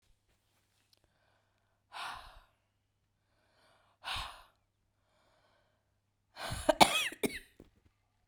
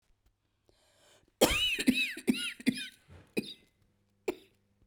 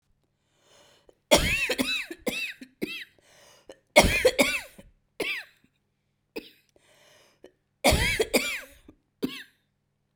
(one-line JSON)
{"exhalation_length": "8.3 s", "exhalation_amplitude": 17901, "exhalation_signal_mean_std_ratio": 0.21, "cough_length": "4.9 s", "cough_amplitude": 13146, "cough_signal_mean_std_ratio": 0.37, "three_cough_length": "10.2 s", "three_cough_amplitude": 25188, "three_cough_signal_mean_std_ratio": 0.37, "survey_phase": "beta (2021-08-13 to 2022-03-07)", "age": "18-44", "gender": "Female", "wearing_mask": "No", "symptom_cough_any": true, "symptom_runny_or_blocked_nose": true, "symptom_sore_throat": true, "symptom_diarrhoea": true, "symptom_fatigue": true, "symptom_fever_high_temperature": true, "symptom_headache": true, "symptom_change_to_sense_of_smell_or_taste": true, "symptom_loss_of_taste": true, "symptom_onset": "2 days", "smoker_status": "Never smoked", "respiratory_condition_asthma": false, "respiratory_condition_other": false, "recruitment_source": "Test and Trace", "submission_delay": "2 days", "covid_test_method": "RT-qPCR", "covid_ct_value": 24.0, "covid_ct_gene": "ORF1ab gene"}